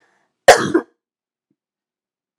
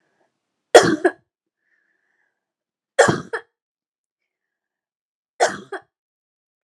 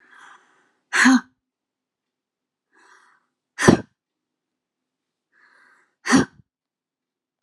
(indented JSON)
{
  "cough_length": "2.4 s",
  "cough_amplitude": 32768,
  "cough_signal_mean_std_ratio": 0.22,
  "three_cough_length": "6.7 s",
  "three_cough_amplitude": 32768,
  "three_cough_signal_mean_std_ratio": 0.21,
  "exhalation_length": "7.4 s",
  "exhalation_amplitude": 32767,
  "exhalation_signal_mean_std_ratio": 0.23,
  "survey_phase": "beta (2021-08-13 to 2022-03-07)",
  "age": "45-64",
  "gender": "Female",
  "wearing_mask": "No",
  "symptom_none": true,
  "symptom_onset": "8 days",
  "smoker_status": "Never smoked",
  "respiratory_condition_asthma": true,
  "respiratory_condition_other": true,
  "recruitment_source": "REACT",
  "submission_delay": "3 days",
  "covid_test_result": "Negative",
  "covid_test_method": "RT-qPCR"
}